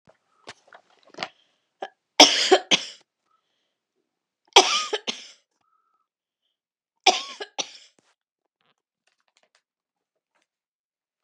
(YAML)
three_cough_length: 11.2 s
three_cough_amplitude: 32767
three_cough_signal_mean_std_ratio: 0.2
survey_phase: beta (2021-08-13 to 2022-03-07)
age: 65+
gender: Female
wearing_mask: 'No'
symptom_none: true
smoker_status: Ex-smoker
respiratory_condition_asthma: false
respiratory_condition_other: false
recruitment_source: REACT
submission_delay: 2 days
covid_test_result: Negative
covid_test_method: RT-qPCR
influenza_a_test_result: Negative
influenza_b_test_result: Negative